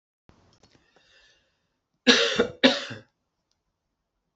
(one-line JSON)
{"cough_length": "4.4 s", "cough_amplitude": 26569, "cough_signal_mean_std_ratio": 0.27, "survey_phase": "beta (2021-08-13 to 2022-03-07)", "age": "65+", "gender": "Female", "wearing_mask": "No", "symptom_none": true, "symptom_onset": "12 days", "smoker_status": "Ex-smoker", "respiratory_condition_asthma": false, "respiratory_condition_other": false, "recruitment_source": "REACT", "submission_delay": "2 days", "covid_test_result": "Negative", "covid_test_method": "RT-qPCR", "influenza_a_test_result": "Negative", "influenza_b_test_result": "Negative"}